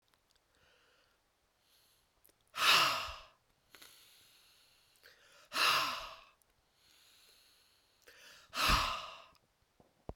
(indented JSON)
{
  "exhalation_length": "10.2 s",
  "exhalation_amplitude": 7204,
  "exhalation_signal_mean_std_ratio": 0.32,
  "survey_phase": "beta (2021-08-13 to 2022-03-07)",
  "age": "18-44",
  "gender": "Female",
  "wearing_mask": "No",
  "symptom_sore_throat": true,
  "smoker_status": "Never smoked",
  "respiratory_condition_asthma": false,
  "respiratory_condition_other": false,
  "recruitment_source": "Test and Trace",
  "submission_delay": "2 days",
  "covid_test_result": "Positive",
  "covid_test_method": "ePCR"
}